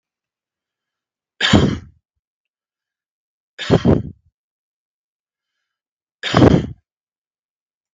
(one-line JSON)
{"three_cough_length": "7.9 s", "three_cough_amplitude": 32768, "three_cough_signal_mean_std_ratio": 0.27, "survey_phase": "beta (2021-08-13 to 2022-03-07)", "age": "65+", "gender": "Male", "wearing_mask": "No", "symptom_cough_any": true, "symptom_sore_throat": true, "symptom_onset": "3 days", "smoker_status": "Ex-smoker", "respiratory_condition_asthma": false, "respiratory_condition_other": false, "recruitment_source": "Test and Trace", "submission_delay": "2 days", "covid_test_result": "Positive", "covid_test_method": "RT-qPCR", "covid_ct_value": 23.1, "covid_ct_gene": "ORF1ab gene"}